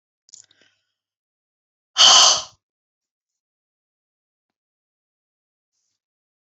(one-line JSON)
{"exhalation_length": "6.5 s", "exhalation_amplitude": 32417, "exhalation_signal_mean_std_ratio": 0.2, "survey_phase": "beta (2021-08-13 to 2022-03-07)", "age": "65+", "gender": "Female", "wearing_mask": "No", "symptom_none": true, "symptom_onset": "8 days", "smoker_status": "Never smoked", "respiratory_condition_asthma": false, "respiratory_condition_other": false, "recruitment_source": "REACT", "submission_delay": "1 day", "covid_test_result": "Negative", "covid_test_method": "RT-qPCR", "influenza_a_test_result": "Negative", "influenza_b_test_result": "Negative"}